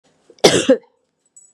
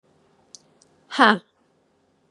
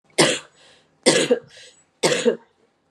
{"cough_length": "1.5 s", "cough_amplitude": 32768, "cough_signal_mean_std_ratio": 0.33, "exhalation_length": "2.3 s", "exhalation_amplitude": 28477, "exhalation_signal_mean_std_ratio": 0.21, "three_cough_length": "2.9 s", "three_cough_amplitude": 31126, "three_cough_signal_mean_std_ratio": 0.42, "survey_phase": "beta (2021-08-13 to 2022-03-07)", "age": "45-64", "gender": "Female", "wearing_mask": "No", "symptom_runny_or_blocked_nose": true, "symptom_sore_throat": true, "symptom_onset": "5 days", "smoker_status": "Never smoked", "respiratory_condition_asthma": false, "respiratory_condition_other": false, "recruitment_source": "REACT", "submission_delay": "1 day", "covid_test_result": "Positive", "covid_test_method": "RT-qPCR", "covid_ct_value": 26.0, "covid_ct_gene": "E gene", "influenza_a_test_result": "Negative", "influenza_b_test_result": "Negative"}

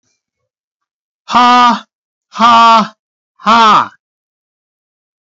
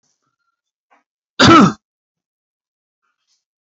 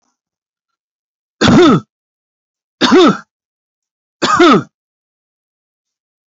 {"exhalation_length": "5.2 s", "exhalation_amplitude": 30857, "exhalation_signal_mean_std_ratio": 0.47, "cough_length": "3.8 s", "cough_amplitude": 32667, "cough_signal_mean_std_ratio": 0.25, "three_cough_length": "6.4 s", "three_cough_amplitude": 31308, "three_cough_signal_mean_std_ratio": 0.36, "survey_phase": "beta (2021-08-13 to 2022-03-07)", "age": "18-44", "gender": "Male", "wearing_mask": "No", "symptom_none": true, "smoker_status": "Never smoked", "respiratory_condition_asthma": false, "respiratory_condition_other": false, "recruitment_source": "Test and Trace", "submission_delay": "3 days", "covid_test_result": "Negative", "covid_test_method": "RT-qPCR"}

